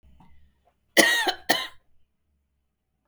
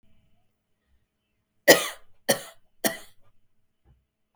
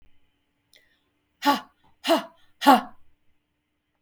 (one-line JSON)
{"cough_length": "3.1 s", "cough_amplitude": 32768, "cough_signal_mean_std_ratio": 0.31, "three_cough_length": "4.4 s", "three_cough_amplitude": 32322, "three_cough_signal_mean_std_ratio": 0.2, "exhalation_length": "4.0 s", "exhalation_amplitude": 24661, "exhalation_signal_mean_std_ratio": 0.26, "survey_phase": "beta (2021-08-13 to 2022-03-07)", "age": "45-64", "gender": "Female", "wearing_mask": "No", "symptom_fatigue": true, "smoker_status": "Ex-smoker", "respiratory_condition_asthma": false, "respiratory_condition_other": false, "recruitment_source": "REACT", "submission_delay": "2 days", "covid_test_result": "Negative", "covid_test_method": "RT-qPCR", "influenza_a_test_result": "Negative", "influenza_b_test_result": "Negative"}